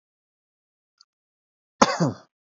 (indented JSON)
{
  "cough_length": "2.6 s",
  "cough_amplitude": 28211,
  "cough_signal_mean_std_ratio": 0.21,
  "survey_phase": "beta (2021-08-13 to 2022-03-07)",
  "age": "18-44",
  "gender": "Male",
  "wearing_mask": "No",
  "symptom_none": true,
  "smoker_status": "Never smoked",
  "respiratory_condition_asthma": false,
  "respiratory_condition_other": false,
  "recruitment_source": "REACT",
  "submission_delay": "1 day",
  "covid_test_result": "Negative",
  "covid_test_method": "RT-qPCR",
  "influenza_a_test_result": "Negative",
  "influenza_b_test_result": "Negative"
}